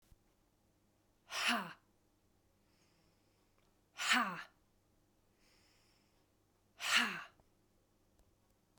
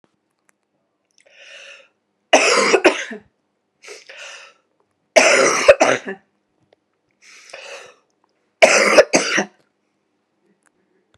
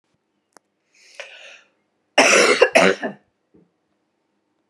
{"exhalation_length": "8.8 s", "exhalation_amplitude": 4961, "exhalation_signal_mean_std_ratio": 0.29, "three_cough_length": "11.2 s", "three_cough_amplitude": 32768, "three_cough_signal_mean_std_ratio": 0.34, "cough_length": "4.7 s", "cough_amplitude": 32722, "cough_signal_mean_std_ratio": 0.32, "survey_phase": "alpha (2021-03-01 to 2021-08-12)", "age": "45-64", "gender": "Male", "wearing_mask": "No", "symptom_fatigue": true, "symptom_headache": true, "symptom_change_to_sense_of_smell_or_taste": true, "symptom_loss_of_taste": true, "symptom_onset": "8 days", "smoker_status": "Never smoked", "respiratory_condition_asthma": false, "respiratory_condition_other": false, "recruitment_source": "Test and Trace", "submission_delay": "6 days", "covid_test_result": "Positive", "covid_test_method": "RT-qPCR"}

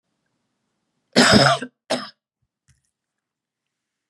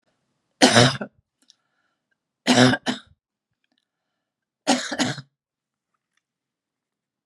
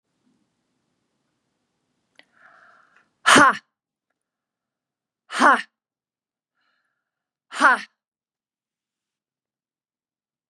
{"cough_length": "4.1 s", "cough_amplitude": 30513, "cough_signal_mean_std_ratio": 0.28, "three_cough_length": "7.3 s", "three_cough_amplitude": 30457, "three_cough_signal_mean_std_ratio": 0.28, "exhalation_length": "10.5 s", "exhalation_amplitude": 32636, "exhalation_signal_mean_std_ratio": 0.2, "survey_phase": "beta (2021-08-13 to 2022-03-07)", "age": "65+", "gender": "Female", "wearing_mask": "No", "symptom_none": true, "smoker_status": "Ex-smoker", "respiratory_condition_asthma": true, "respiratory_condition_other": false, "recruitment_source": "REACT", "submission_delay": "1 day", "covid_test_result": "Negative", "covid_test_method": "RT-qPCR", "influenza_a_test_result": "Negative", "influenza_b_test_result": "Negative"}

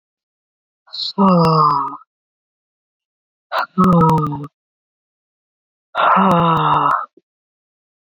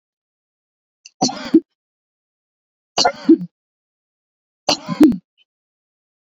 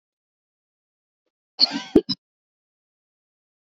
{"exhalation_length": "8.1 s", "exhalation_amplitude": 30563, "exhalation_signal_mean_std_ratio": 0.5, "three_cough_length": "6.4 s", "three_cough_amplitude": 28385, "three_cough_signal_mean_std_ratio": 0.26, "cough_length": "3.7 s", "cough_amplitude": 26300, "cough_signal_mean_std_ratio": 0.17, "survey_phase": "beta (2021-08-13 to 2022-03-07)", "age": "45-64", "gender": "Female", "wearing_mask": "No", "symptom_none": true, "smoker_status": "Never smoked", "respiratory_condition_asthma": false, "respiratory_condition_other": false, "recruitment_source": "REACT", "submission_delay": "1 day", "covid_test_result": "Negative", "covid_test_method": "RT-qPCR"}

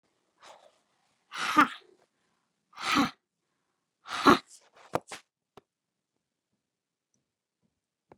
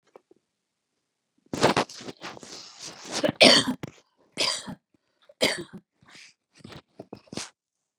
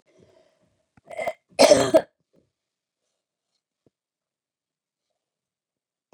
{"exhalation_length": "8.2 s", "exhalation_amplitude": 18176, "exhalation_signal_mean_std_ratio": 0.22, "three_cough_length": "8.0 s", "three_cough_amplitude": 26313, "three_cough_signal_mean_std_ratio": 0.29, "cough_length": "6.1 s", "cough_amplitude": 26178, "cough_signal_mean_std_ratio": 0.2, "survey_phase": "beta (2021-08-13 to 2022-03-07)", "age": "65+", "gender": "Female", "wearing_mask": "No", "symptom_none": true, "smoker_status": "Never smoked", "respiratory_condition_asthma": false, "respiratory_condition_other": false, "recruitment_source": "REACT", "submission_delay": "2 days", "covid_test_result": "Negative", "covid_test_method": "RT-qPCR", "influenza_a_test_result": "Negative", "influenza_b_test_result": "Negative"}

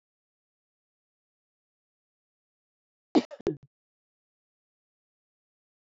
{"cough_length": "5.9 s", "cough_amplitude": 11465, "cough_signal_mean_std_ratio": 0.11, "survey_phase": "beta (2021-08-13 to 2022-03-07)", "age": "45-64", "gender": "Female", "wearing_mask": "No", "symptom_cough_any": true, "symptom_sore_throat": true, "symptom_fatigue": true, "symptom_headache": true, "smoker_status": "Never smoked", "respiratory_condition_asthma": true, "respiratory_condition_other": false, "recruitment_source": "Test and Trace", "submission_delay": "2 days", "covid_test_result": "Positive", "covid_test_method": "RT-qPCR"}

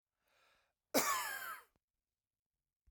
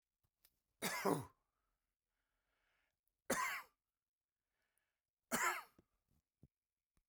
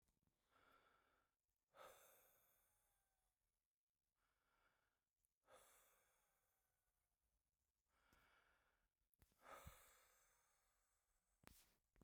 {"cough_length": "2.9 s", "cough_amplitude": 4305, "cough_signal_mean_std_ratio": 0.33, "three_cough_length": "7.1 s", "three_cough_amplitude": 2617, "three_cough_signal_mean_std_ratio": 0.29, "exhalation_length": "12.0 s", "exhalation_amplitude": 304, "exhalation_signal_mean_std_ratio": 0.43, "survey_phase": "beta (2021-08-13 to 2022-03-07)", "age": "45-64", "gender": "Male", "wearing_mask": "No", "symptom_none": true, "smoker_status": "Never smoked", "respiratory_condition_asthma": true, "respiratory_condition_other": false, "recruitment_source": "REACT", "submission_delay": "1 day", "covid_test_result": "Negative", "covid_test_method": "RT-qPCR"}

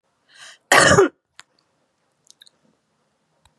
{"cough_length": "3.6 s", "cough_amplitude": 32767, "cough_signal_mean_std_ratio": 0.26, "survey_phase": "beta (2021-08-13 to 2022-03-07)", "age": "45-64", "gender": "Female", "wearing_mask": "No", "symptom_cough_any": true, "smoker_status": "Never smoked", "respiratory_condition_asthma": false, "respiratory_condition_other": false, "recruitment_source": "REACT", "submission_delay": "0 days", "covid_test_result": "Negative", "covid_test_method": "RT-qPCR", "influenza_a_test_result": "Negative", "influenza_b_test_result": "Negative"}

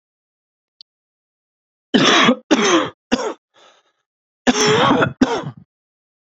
{"cough_length": "6.3 s", "cough_amplitude": 30333, "cough_signal_mean_std_ratio": 0.44, "survey_phase": "beta (2021-08-13 to 2022-03-07)", "age": "18-44", "gender": "Male", "wearing_mask": "No", "symptom_cough_any": true, "symptom_shortness_of_breath": true, "symptom_diarrhoea": true, "symptom_fatigue": true, "symptom_fever_high_temperature": true, "symptom_headache": true, "symptom_change_to_sense_of_smell_or_taste": true, "symptom_loss_of_taste": true, "symptom_onset": "3 days", "smoker_status": "Current smoker (e-cigarettes or vapes only)", "respiratory_condition_asthma": false, "respiratory_condition_other": false, "recruitment_source": "Test and Trace", "submission_delay": "1 day", "covid_test_result": "Positive", "covid_test_method": "RT-qPCR", "covid_ct_value": 19.1, "covid_ct_gene": "ORF1ab gene", "covid_ct_mean": 20.3, "covid_viral_load": "230000 copies/ml", "covid_viral_load_category": "Low viral load (10K-1M copies/ml)"}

